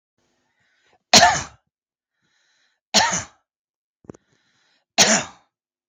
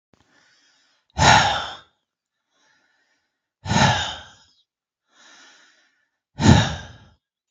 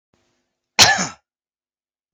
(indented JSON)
{
  "three_cough_length": "5.9 s",
  "three_cough_amplitude": 32768,
  "three_cough_signal_mean_std_ratio": 0.27,
  "exhalation_length": "7.5 s",
  "exhalation_amplitude": 32768,
  "exhalation_signal_mean_std_ratio": 0.31,
  "cough_length": "2.1 s",
  "cough_amplitude": 32768,
  "cough_signal_mean_std_ratio": 0.26,
  "survey_phase": "alpha (2021-03-01 to 2021-08-12)",
  "age": "45-64",
  "gender": "Male",
  "wearing_mask": "No",
  "symptom_none": true,
  "symptom_onset": "12 days",
  "smoker_status": "Ex-smoker",
  "respiratory_condition_asthma": false,
  "respiratory_condition_other": false,
  "recruitment_source": "REACT",
  "submission_delay": "2 days",
  "covid_test_result": "Negative",
  "covid_test_method": "RT-qPCR"
}